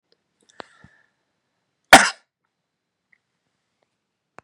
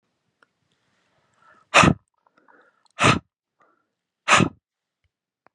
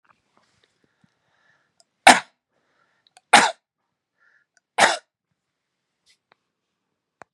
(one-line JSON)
{"cough_length": "4.4 s", "cough_amplitude": 32768, "cough_signal_mean_std_ratio": 0.13, "exhalation_length": "5.5 s", "exhalation_amplitude": 32592, "exhalation_signal_mean_std_ratio": 0.24, "three_cough_length": "7.3 s", "three_cough_amplitude": 32768, "three_cough_signal_mean_std_ratio": 0.17, "survey_phase": "beta (2021-08-13 to 2022-03-07)", "age": "45-64", "gender": "Male", "wearing_mask": "No", "symptom_none": true, "smoker_status": "Never smoked", "respiratory_condition_asthma": false, "respiratory_condition_other": false, "recruitment_source": "REACT", "submission_delay": "1 day", "covid_test_result": "Negative", "covid_test_method": "RT-qPCR", "influenza_a_test_result": "Negative", "influenza_b_test_result": "Negative"}